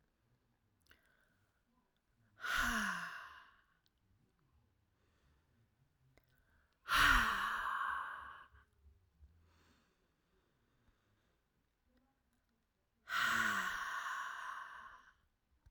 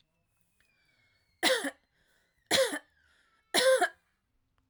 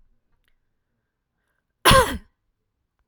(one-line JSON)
{"exhalation_length": "15.7 s", "exhalation_amplitude": 3982, "exhalation_signal_mean_std_ratio": 0.37, "three_cough_length": "4.7 s", "three_cough_amplitude": 8836, "three_cough_signal_mean_std_ratio": 0.35, "cough_length": "3.1 s", "cough_amplitude": 31158, "cough_signal_mean_std_ratio": 0.23, "survey_phase": "alpha (2021-03-01 to 2021-08-12)", "age": "18-44", "gender": "Female", "wearing_mask": "No", "symptom_none": true, "smoker_status": "Never smoked", "respiratory_condition_asthma": false, "respiratory_condition_other": false, "recruitment_source": "REACT", "submission_delay": "1 day", "covid_test_result": "Negative", "covid_test_method": "RT-qPCR"}